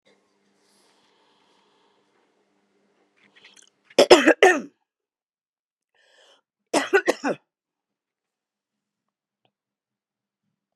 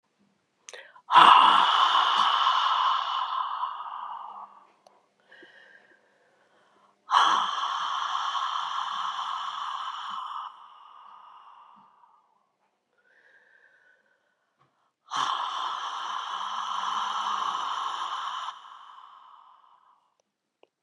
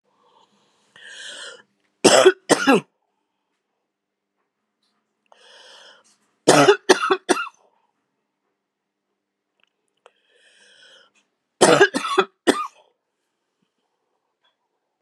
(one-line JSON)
{"cough_length": "10.8 s", "cough_amplitude": 32768, "cough_signal_mean_std_ratio": 0.19, "exhalation_length": "20.8 s", "exhalation_amplitude": 24693, "exhalation_signal_mean_std_ratio": 0.47, "three_cough_length": "15.0 s", "three_cough_amplitude": 32768, "three_cough_signal_mean_std_ratio": 0.26, "survey_phase": "beta (2021-08-13 to 2022-03-07)", "age": "65+", "gender": "Female", "wearing_mask": "No", "symptom_cough_any": true, "symptom_new_continuous_cough": true, "symptom_runny_or_blocked_nose": true, "symptom_fatigue": true, "symptom_headache": true, "symptom_change_to_sense_of_smell_or_taste": true, "smoker_status": "Never smoked", "respiratory_condition_asthma": false, "respiratory_condition_other": false, "recruitment_source": "Test and Trace", "submission_delay": "1 day", "covid_test_result": "Positive", "covid_test_method": "RT-qPCR", "covid_ct_value": 15.4, "covid_ct_gene": "ORF1ab gene", "covid_ct_mean": 16.4, "covid_viral_load": "4100000 copies/ml", "covid_viral_load_category": "High viral load (>1M copies/ml)"}